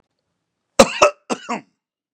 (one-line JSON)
{"cough_length": "2.1 s", "cough_amplitude": 32768, "cough_signal_mean_std_ratio": 0.27, "survey_phase": "beta (2021-08-13 to 2022-03-07)", "age": "45-64", "gender": "Male", "wearing_mask": "No", "symptom_none": true, "smoker_status": "Ex-smoker", "respiratory_condition_asthma": false, "respiratory_condition_other": false, "recruitment_source": "REACT", "submission_delay": "3 days", "covid_test_result": "Negative", "covid_test_method": "RT-qPCR", "influenza_a_test_result": "Negative", "influenza_b_test_result": "Negative"}